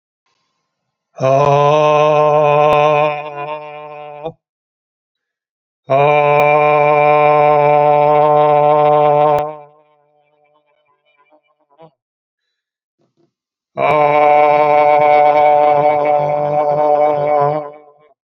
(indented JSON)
{
  "exhalation_length": "18.3 s",
  "exhalation_amplitude": 31293,
  "exhalation_signal_mean_std_ratio": 0.69,
  "survey_phase": "beta (2021-08-13 to 2022-03-07)",
  "age": "65+",
  "gender": "Male",
  "wearing_mask": "No",
  "symptom_none": true,
  "smoker_status": "Ex-smoker",
  "respiratory_condition_asthma": true,
  "respiratory_condition_other": false,
  "recruitment_source": "REACT",
  "submission_delay": "3 days",
  "covid_test_result": "Negative",
  "covid_test_method": "RT-qPCR"
}